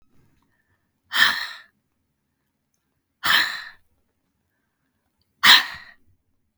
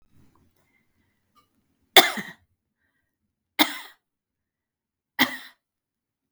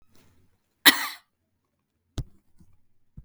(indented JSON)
{
  "exhalation_length": "6.6 s",
  "exhalation_amplitude": 32768,
  "exhalation_signal_mean_std_ratio": 0.26,
  "three_cough_length": "6.3 s",
  "three_cough_amplitude": 32768,
  "three_cough_signal_mean_std_ratio": 0.17,
  "cough_length": "3.2 s",
  "cough_amplitude": 32768,
  "cough_signal_mean_std_ratio": 0.18,
  "survey_phase": "beta (2021-08-13 to 2022-03-07)",
  "age": "65+",
  "gender": "Female",
  "wearing_mask": "No",
  "symptom_none": true,
  "symptom_onset": "12 days",
  "smoker_status": "Never smoked",
  "respiratory_condition_asthma": false,
  "respiratory_condition_other": false,
  "recruitment_source": "REACT",
  "submission_delay": "1 day",
  "covid_test_result": "Negative",
  "covid_test_method": "RT-qPCR"
}